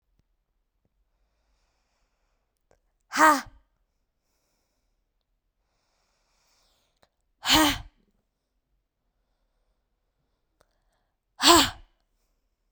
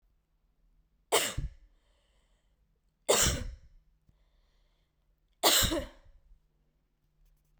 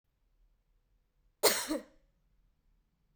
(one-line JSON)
{"exhalation_length": "12.7 s", "exhalation_amplitude": 27413, "exhalation_signal_mean_std_ratio": 0.2, "three_cough_length": "7.6 s", "three_cough_amplitude": 10419, "three_cough_signal_mean_std_ratio": 0.3, "cough_length": "3.2 s", "cough_amplitude": 11205, "cough_signal_mean_std_ratio": 0.24, "survey_phase": "beta (2021-08-13 to 2022-03-07)", "age": "18-44", "gender": "Female", "wearing_mask": "No", "symptom_cough_any": true, "symptom_runny_or_blocked_nose": true, "symptom_shortness_of_breath": true, "symptom_fatigue": true, "smoker_status": "Never smoked", "respiratory_condition_asthma": true, "respiratory_condition_other": false, "recruitment_source": "Test and Trace", "submission_delay": "1 day", "covid_test_result": "Positive", "covid_test_method": "RT-qPCR", "covid_ct_value": 29.4, "covid_ct_gene": "N gene", "covid_ct_mean": 29.6, "covid_viral_load": "200 copies/ml", "covid_viral_load_category": "Minimal viral load (< 10K copies/ml)"}